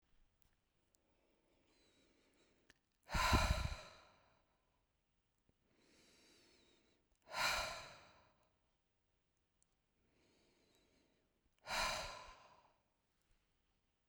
{"exhalation_length": "14.1 s", "exhalation_amplitude": 3443, "exhalation_signal_mean_std_ratio": 0.27, "survey_phase": "beta (2021-08-13 to 2022-03-07)", "age": "45-64", "gender": "Female", "wearing_mask": "No", "symptom_none": true, "smoker_status": "Never smoked", "respiratory_condition_asthma": false, "respiratory_condition_other": false, "recruitment_source": "REACT", "submission_delay": "1 day", "covid_test_result": "Negative", "covid_test_method": "RT-qPCR"}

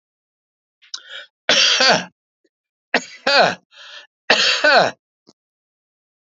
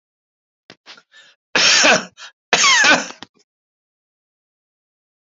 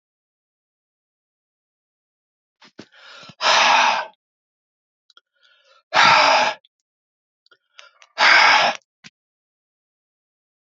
{"three_cough_length": "6.2 s", "three_cough_amplitude": 29726, "three_cough_signal_mean_std_ratio": 0.4, "cough_length": "5.4 s", "cough_amplitude": 31759, "cough_signal_mean_std_ratio": 0.36, "exhalation_length": "10.8 s", "exhalation_amplitude": 28593, "exhalation_signal_mean_std_ratio": 0.33, "survey_phase": "alpha (2021-03-01 to 2021-08-12)", "age": "65+", "gender": "Male", "wearing_mask": "No", "symptom_none": true, "smoker_status": "Ex-smoker", "respiratory_condition_asthma": false, "respiratory_condition_other": false, "recruitment_source": "REACT", "submission_delay": "2 days", "covid_test_result": "Negative", "covid_test_method": "RT-qPCR"}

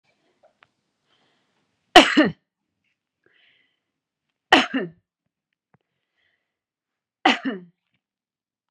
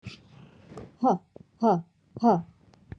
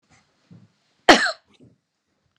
{"three_cough_length": "8.7 s", "three_cough_amplitude": 32768, "three_cough_signal_mean_std_ratio": 0.2, "exhalation_length": "3.0 s", "exhalation_amplitude": 11451, "exhalation_signal_mean_std_ratio": 0.39, "cough_length": "2.4 s", "cough_amplitude": 32768, "cough_signal_mean_std_ratio": 0.21, "survey_phase": "beta (2021-08-13 to 2022-03-07)", "age": "45-64", "gender": "Female", "wearing_mask": "No", "symptom_none": true, "smoker_status": "Ex-smoker", "respiratory_condition_asthma": false, "respiratory_condition_other": false, "recruitment_source": "REACT", "submission_delay": "1 day", "covid_test_result": "Negative", "covid_test_method": "RT-qPCR"}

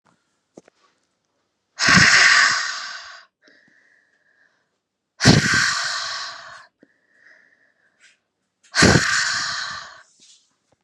{"exhalation_length": "10.8 s", "exhalation_amplitude": 32767, "exhalation_signal_mean_std_ratio": 0.39, "survey_phase": "beta (2021-08-13 to 2022-03-07)", "age": "18-44", "gender": "Female", "wearing_mask": "No", "symptom_cough_any": true, "symptom_new_continuous_cough": true, "symptom_shortness_of_breath": true, "symptom_sore_throat": true, "symptom_fatigue": true, "symptom_fever_high_temperature": true, "symptom_headache": true, "symptom_onset": "3 days", "smoker_status": "Never smoked", "respiratory_condition_asthma": false, "respiratory_condition_other": false, "recruitment_source": "Test and Trace", "submission_delay": "2 days", "covid_test_result": "Positive", "covid_test_method": "RT-qPCR", "covid_ct_value": 22.7, "covid_ct_gene": "ORF1ab gene"}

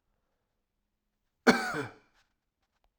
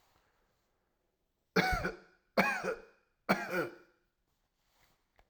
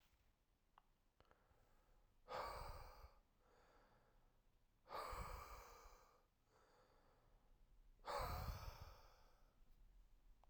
{"cough_length": "3.0 s", "cough_amplitude": 13445, "cough_signal_mean_std_ratio": 0.22, "three_cough_length": "5.3 s", "three_cough_amplitude": 8940, "three_cough_signal_mean_std_ratio": 0.35, "exhalation_length": "10.5 s", "exhalation_amplitude": 512, "exhalation_signal_mean_std_ratio": 0.49, "survey_phase": "beta (2021-08-13 to 2022-03-07)", "age": "18-44", "gender": "Male", "wearing_mask": "No", "symptom_none": true, "smoker_status": "Never smoked", "respiratory_condition_asthma": false, "respiratory_condition_other": false, "recruitment_source": "REACT", "submission_delay": "4 days", "covid_test_result": "Negative", "covid_test_method": "RT-qPCR"}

